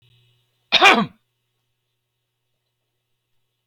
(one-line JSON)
{"cough_length": "3.7 s", "cough_amplitude": 31137, "cough_signal_mean_std_ratio": 0.22, "survey_phase": "beta (2021-08-13 to 2022-03-07)", "age": "65+", "gender": "Male", "wearing_mask": "No", "symptom_none": true, "smoker_status": "Never smoked", "respiratory_condition_asthma": false, "respiratory_condition_other": false, "recruitment_source": "REACT", "submission_delay": "2 days", "covid_test_result": "Negative", "covid_test_method": "RT-qPCR"}